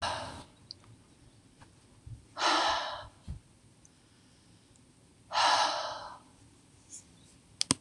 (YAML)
exhalation_length: 7.8 s
exhalation_amplitude: 22575
exhalation_signal_mean_std_ratio: 0.4
survey_phase: beta (2021-08-13 to 2022-03-07)
age: 65+
gender: Female
wearing_mask: 'No'
symptom_none: true
smoker_status: Never smoked
respiratory_condition_asthma: false
respiratory_condition_other: false
recruitment_source: REACT
submission_delay: 2 days
covid_test_result: Negative
covid_test_method: RT-qPCR
influenza_a_test_result: Negative
influenza_b_test_result: Negative